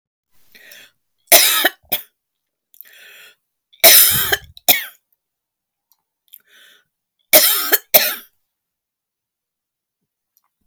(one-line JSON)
{"three_cough_length": "10.7 s", "three_cough_amplitude": 32768, "three_cough_signal_mean_std_ratio": 0.29, "survey_phase": "beta (2021-08-13 to 2022-03-07)", "age": "45-64", "gender": "Female", "wearing_mask": "No", "symptom_fatigue": true, "symptom_loss_of_taste": true, "smoker_status": "Never smoked", "respiratory_condition_asthma": true, "respiratory_condition_other": false, "recruitment_source": "REACT", "submission_delay": "2 days", "covid_test_result": "Negative", "covid_test_method": "RT-qPCR"}